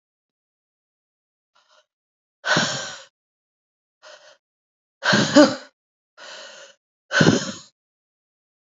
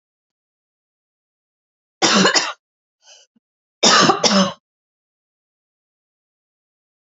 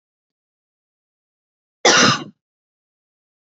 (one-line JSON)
{"exhalation_length": "8.7 s", "exhalation_amplitude": 28198, "exhalation_signal_mean_std_ratio": 0.27, "three_cough_length": "7.1 s", "three_cough_amplitude": 31357, "three_cough_signal_mean_std_ratio": 0.31, "cough_length": "3.4 s", "cough_amplitude": 30636, "cough_signal_mean_std_ratio": 0.25, "survey_phase": "beta (2021-08-13 to 2022-03-07)", "age": "18-44", "gender": "Female", "wearing_mask": "No", "symptom_new_continuous_cough": true, "symptom_runny_or_blocked_nose": true, "symptom_onset": "2 days", "smoker_status": "Ex-smoker", "respiratory_condition_asthma": false, "respiratory_condition_other": false, "recruitment_source": "Test and Trace", "submission_delay": "1 day", "covid_test_result": "Positive", "covid_test_method": "RT-qPCR"}